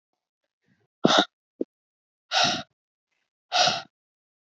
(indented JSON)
{
  "exhalation_length": "4.4 s",
  "exhalation_amplitude": 24980,
  "exhalation_signal_mean_std_ratio": 0.31,
  "survey_phase": "alpha (2021-03-01 to 2021-08-12)",
  "age": "18-44",
  "gender": "Female",
  "wearing_mask": "No",
  "symptom_none": true,
  "smoker_status": "Never smoked",
  "respiratory_condition_asthma": true,
  "respiratory_condition_other": false,
  "recruitment_source": "REACT",
  "submission_delay": "1 day",
  "covid_test_result": "Negative",
  "covid_test_method": "RT-qPCR"
}